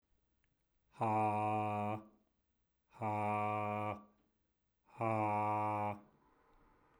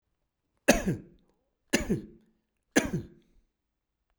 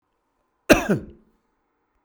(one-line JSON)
{"exhalation_length": "7.0 s", "exhalation_amplitude": 2391, "exhalation_signal_mean_std_ratio": 0.6, "three_cough_length": "4.2 s", "three_cough_amplitude": 18822, "three_cough_signal_mean_std_ratio": 0.29, "cough_length": "2.0 s", "cough_amplitude": 32768, "cough_signal_mean_std_ratio": 0.24, "survey_phase": "beta (2021-08-13 to 2022-03-07)", "age": "45-64", "gender": "Male", "wearing_mask": "No", "symptom_cough_any": true, "symptom_headache": true, "symptom_change_to_sense_of_smell_or_taste": true, "symptom_loss_of_taste": true, "symptom_onset": "6 days", "smoker_status": "Never smoked", "respiratory_condition_asthma": false, "respiratory_condition_other": false, "recruitment_source": "Test and Trace", "submission_delay": "2 days", "covid_test_result": "Positive", "covid_test_method": "RT-qPCR"}